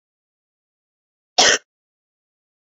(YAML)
cough_length: 2.7 s
cough_amplitude: 32465
cough_signal_mean_std_ratio: 0.21
survey_phase: beta (2021-08-13 to 2022-03-07)
age: 18-44
gender: Female
wearing_mask: 'No'
symptom_none: true
smoker_status: Never smoked
respiratory_condition_asthma: true
respiratory_condition_other: false
recruitment_source: REACT
submission_delay: 2 days
covid_test_result: Negative
covid_test_method: RT-qPCR
influenza_a_test_result: Negative
influenza_b_test_result: Negative